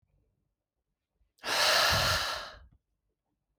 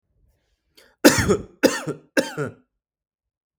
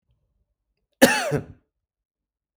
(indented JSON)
{
  "exhalation_length": "3.6 s",
  "exhalation_amplitude": 8888,
  "exhalation_signal_mean_std_ratio": 0.44,
  "three_cough_length": "3.6 s",
  "three_cough_amplitude": 32768,
  "three_cough_signal_mean_std_ratio": 0.32,
  "cough_length": "2.6 s",
  "cough_amplitude": 32768,
  "cough_signal_mean_std_ratio": 0.25,
  "survey_phase": "beta (2021-08-13 to 2022-03-07)",
  "age": "18-44",
  "gender": "Male",
  "wearing_mask": "No",
  "symptom_none": true,
  "smoker_status": "Ex-smoker",
  "respiratory_condition_asthma": false,
  "respiratory_condition_other": false,
  "recruitment_source": "REACT",
  "submission_delay": "1 day",
  "covid_test_result": "Negative",
  "covid_test_method": "RT-qPCR",
  "influenza_a_test_result": "Negative",
  "influenza_b_test_result": "Negative"
}